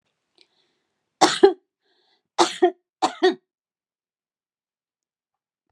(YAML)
three_cough_length: 5.7 s
three_cough_amplitude: 32767
three_cough_signal_mean_std_ratio: 0.24
survey_phase: beta (2021-08-13 to 2022-03-07)
age: 65+
gender: Female
wearing_mask: 'No'
symptom_sore_throat: true
symptom_fatigue: true
symptom_headache: true
smoker_status: Ex-smoker
respiratory_condition_asthma: false
respiratory_condition_other: false
recruitment_source: REACT
submission_delay: 15 days
covid_test_result: Negative
covid_test_method: RT-qPCR